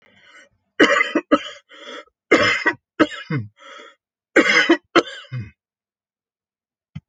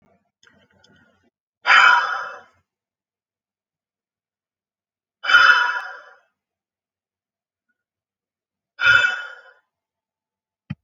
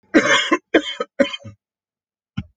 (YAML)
three_cough_length: 7.1 s
three_cough_amplitude: 28805
three_cough_signal_mean_std_ratio: 0.38
exhalation_length: 10.8 s
exhalation_amplitude: 29409
exhalation_signal_mean_std_ratio: 0.29
cough_length: 2.6 s
cough_amplitude: 27992
cough_signal_mean_std_ratio: 0.4
survey_phase: alpha (2021-03-01 to 2021-08-12)
age: 45-64
gender: Male
wearing_mask: 'No'
symptom_none: true
smoker_status: Never smoked
respiratory_condition_asthma: false
respiratory_condition_other: false
recruitment_source: REACT
submission_delay: 2 days
covid_test_result: Negative
covid_test_method: RT-qPCR